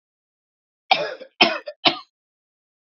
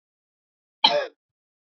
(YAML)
three_cough_length: 2.8 s
three_cough_amplitude: 32767
three_cough_signal_mean_std_ratio: 0.28
cough_length: 1.7 s
cough_amplitude: 28757
cough_signal_mean_std_ratio: 0.25
survey_phase: beta (2021-08-13 to 2022-03-07)
age: 45-64
gender: Male
wearing_mask: 'No'
symptom_cough_any: true
symptom_fatigue: true
symptom_headache: true
symptom_change_to_sense_of_smell_or_taste: true
symptom_onset: 3 days
smoker_status: Never smoked
respiratory_condition_asthma: false
respiratory_condition_other: false
recruitment_source: Test and Trace
submission_delay: 2 days
covid_test_result: Positive
covid_test_method: RT-qPCR
covid_ct_value: 16.2
covid_ct_gene: ORF1ab gene
covid_ct_mean: 17.1
covid_viral_load: 2400000 copies/ml
covid_viral_load_category: High viral load (>1M copies/ml)